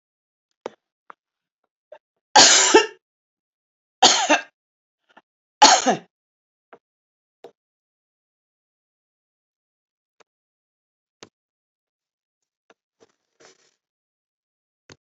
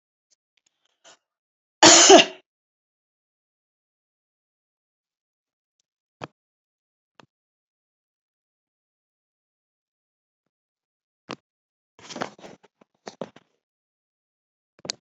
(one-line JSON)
{"three_cough_length": "15.1 s", "three_cough_amplitude": 32392, "three_cough_signal_mean_std_ratio": 0.2, "cough_length": "15.0 s", "cough_amplitude": 31332, "cough_signal_mean_std_ratio": 0.14, "survey_phase": "beta (2021-08-13 to 2022-03-07)", "age": "65+", "gender": "Female", "wearing_mask": "No", "symptom_cough_any": true, "symptom_sore_throat": true, "symptom_onset": "12 days", "smoker_status": "Never smoked", "respiratory_condition_asthma": false, "respiratory_condition_other": false, "recruitment_source": "REACT", "submission_delay": "0 days", "covid_test_result": "Negative", "covid_test_method": "RT-qPCR", "influenza_a_test_result": "Unknown/Void", "influenza_b_test_result": "Unknown/Void"}